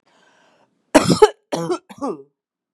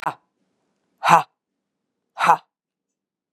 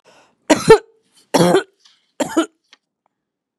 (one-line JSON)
{"cough_length": "2.7 s", "cough_amplitude": 32768, "cough_signal_mean_std_ratio": 0.31, "exhalation_length": "3.3 s", "exhalation_amplitude": 32767, "exhalation_signal_mean_std_ratio": 0.24, "three_cough_length": "3.6 s", "three_cough_amplitude": 32768, "three_cough_signal_mean_std_ratio": 0.31, "survey_phase": "beta (2021-08-13 to 2022-03-07)", "age": "45-64", "gender": "Female", "wearing_mask": "No", "symptom_none": true, "smoker_status": "Never smoked", "respiratory_condition_asthma": false, "respiratory_condition_other": false, "recruitment_source": "REACT", "submission_delay": "1 day", "covid_test_result": "Negative", "covid_test_method": "RT-qPCR", "influenza_a_test_result": "Negative", "influenza_b_test_result": "Negative"}